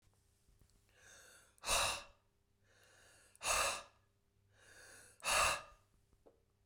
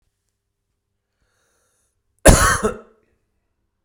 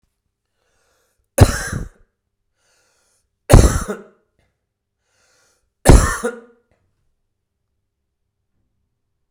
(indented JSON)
{
  "exhalation_length": "6.7 s",
  "exhalation_amplitude": 2741,
  "exhalation_signal_mean_std_ratio": 0.36,
  "cough_length": "3.8 s",
  "cough_amplitude": 32768,
  "cough_signal_mean_std_ratio": 0.24,
  "three_cough_length": "9.3 s",
  "three_cough_amplitude": 32768,
  "three_cough_signal_mean_std_ratio": 0.23,
  "survey_phase": "beta (2021-08-13 to 2022-03-07)",
  "age": "45-64",
  "gender": "Male",
  "wearing_mask": "No",
  "symptom_cough_any": true,
  "symptom_new_continuous_cough": true,
  "symptom_runny_or_blocked_nose": true,
  "symptom_shortness_of_breath": true,
  "symptom_sore_throat": true,
  "symptom_fatigue": true,
  "symptom_headache": true,
  "symptom_change_to_sense_of_smell_or_taste": true,
  "symptom_onset": "5 days",
  "smoker_status": "Never smoked",
  "respiratory_condition_asthma": false,
  "respiratory_condition_other": false,
  "recruitment_source": "Test and Trace",
  "submission_delay": "2 days",
  "covid_test_result": "Positive",
  "covid_test_method": "RT-qPCR",
  "covid_ct_value": 16.9,
  "covid_ct_gene": "ORF1ab gene"
}